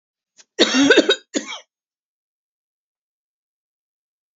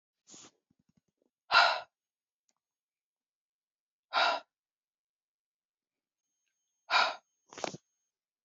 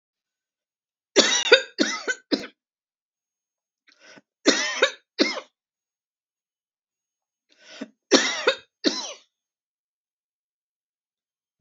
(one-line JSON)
{"cough_length": "4.4 s", "cough_amplitude": 32245, "cough_signal_mean_std_ratio": 0.28, "exhalation_length": "8.4 s", "exhalation_amplitude": 9541, "exhalation_signal_mean_std_ratio": 0.23, "three_cough_length": "11.6 s", "three_cough_amplitude": 31665, "three_cough_signal_mean_std_ratio": 0.28, "survey_phase": "beta (2021-08-13 to 2022-03-07)", "age": "45-64", "gender": "Female", "wearing_mask": "No", "symptom_none": true, "smoker_status": "Never smoked", "respiratory_condition_asthma": false, "respiratory_condition_other": false, "recruitment_source": "Test and Trace", "submission_delay": "1 day", "covid_test_result": "Negative", "covid_test_method": "RT-qPCR"}